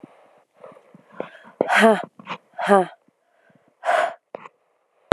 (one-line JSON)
{"exhalation_length": "5.1 s", "exhalation_amplitude": 32768, "exhalation_signal_mean_std_ratio": 0.32, "survey_phase": "beta (2021-08-13 to 2022-03-07)", "age": "18-44", "gender": "Female", "wearing_mask": "No", "symptom_cough_any": true, "symptom_sore_throat": true, "symptom_fatigue": true, "symptom_change_to_sense_of_smell_or_taste": true, "symptom_onset": "4 days", "smoker_status": "Never smoked", "respiratory_condition_asthma": false, "respiratory_condition_other": false, "recruitment_source": "Test and Trace", "submission_delay": "2 days", "covid_test_result": "Positive", "covid_test_method": "RT-qPCR", "covid_ct_value": 15.8, "covid_ct_gene": "ORF1ab gene", "covid_ct_mean": 16.2, "covid_viral_load": "4900000 copies/ml", "covid_viral_load_category": "High viral load (>1M copies/ml)"}